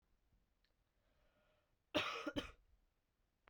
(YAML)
cough_length: 3.5 s
cough_amplitude: 2379
cough_signal_mean_std_ratio: 0.29
survey_phase: beta (2021-08-13 to 2022-03-07)
age: 18-44
gender: Female
wearing_mask: 'No'
symptom_cough_any: true
symptom_runny_or_blocked_nose: true
symptom_sore_throat: true
symptom_headache: true
symptom_other: true
symptom_onset: 2 days
smoker_status: Never smoked
respiratory_condition_asthma: false
respiratory_condition_other: false
recruitment_source: Test and Trace
submission_delay: 1 day
covid_test_result: Positive
covid_test_method: RT-qPCR